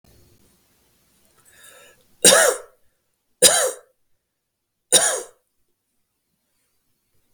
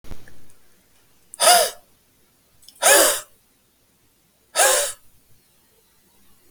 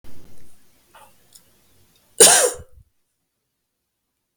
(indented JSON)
{
  "three_cough_length": "7.3 s",
  "three_cough_amplitude": 32768,
  "three_cough_signal_mean_std_ratio": 0.26,
  "exhalation_length": "6.5 s",
  "exhalation_amplitude": 31092,
  "exhalation_signal_mean_std_ratio": 0.35,
  "cough_length": "4.4 s",
  "cough_amplitude": 32768,
  "cough_signal_mean_std_ratio": 0.27,
  "survey_phase": "beta (2021-08-13 to 2022-03-07)",
  "age": "45-64",
  "gender": "Male",
  "wearing_mask": "No",
  "symptom_none": true,
  "smoker_status": "Never smoked",
  "respiratory_condition_asthma": false,
  "respiratory_condition_other": false,
  "recruitment_source": "REACT",
  "submission_delay": "3 days",
  "covid_test_result": "Negative",
  "covid_test_method": "RT-qPCR",
  "influenza_a_test_result": "Negative",
  "influenza_b_test_result": "Negative"
}